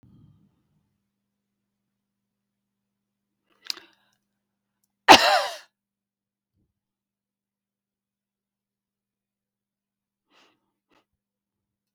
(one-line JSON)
{"cough_length": "11.9 s", "cough_amplitude": 31710, "cough_signal_mean_std_ratio": 0.12, "survey_phase": "beta (2021-08-13 to 2022-03-07)", "age": "65+", "gender": "Female", "wearing_mask": "No", "symptom_none": true, "smoker_status": "Never smoked", "respiratory_condition_asthma": false, "respiratory_condition_other": false, "recruitment_source": "REACT", "submission_delay": "1 day", "covid_test_result": "Negative", "covid_test_method": "RT-qPCR"}